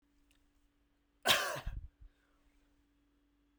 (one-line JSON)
{"cough_length": "3.6 s", "cough_amplitude": 6215, "cough_signal_mean_std_ratio": 0.27, "survey_phase": "beta (2021-08-13 to 2022-03-07)", "age": "18-44", "gender": "Male", "wearing_mask": "No", "symptom_cough_any": true, "smoker_status": "Never smoked", "respiratory_condition_asthma": false, "respiratory_condition_other": false, "recruitment_source": "REACT", "submission_delay": "1 day", "covid_test_result": "Negative", "covid_test_method": "RT-qPCR"}